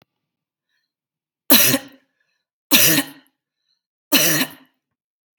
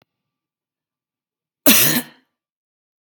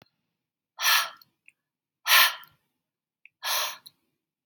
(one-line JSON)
{"three_cough_length": "5.4 s", "three_cough_amplitude": 32768, "three_cough_signal_mean_std_ratio": 0.33, "cough_length": "3.1 s", "cough_amplitude": 32768, "cough_signal_mean_std_ratio": 0.26, "exhalation_length": "4.5 s", "exhalation_amplitude": 18804, "exhalation_signal_mean_std_ratio": 0.31, "survey_phase": "beta (2021-08-13 to 2022-03-07)", "age": "45-64", "gender": "Female", "wearing_mask": "No", "symptom_none": true, "smoker_status": "Never smoked", "respiratory_condition_asthma": false, "respiratory_condition_other": false, "recruitment_source": "Test and Trace", "submission_delay": "1 day", "covid_test_result": "Negative", "covid_test_method": "RT-qPCR"}